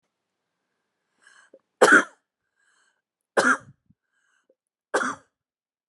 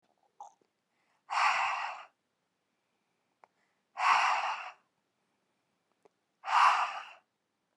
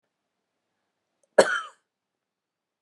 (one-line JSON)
{"three_cough_length": "5.9 s", "three_cough_amplitude": 29033, "three_cough_signal_mean_std_ratio": 0.23, "exhalation_length": "7.8 s", "exhalation_amplitude": 8214, "exhalation_signal_mean_std_ratio": 0.37, "cough_length": "2.8 s", "cough_amplitude": 25841, "cough_signal_mean_std_ratio": 0.17, "survey_phase": "beta (2021-08-13 to 2022-03-07)", "age": "45-64", "gender": "Female", "wearing_mask": "No", "symptom_none": true, "smoker_status": "Current smoker (e-cigarettes or vapes only)", "respiratory_condition_asthma": false, "respiratory_condition_other": false, "recruitment_source": "REACT", "submission_delay": "1 day", "covid_test_result": "Negative", "covid_test_method": "RT-qPCR"}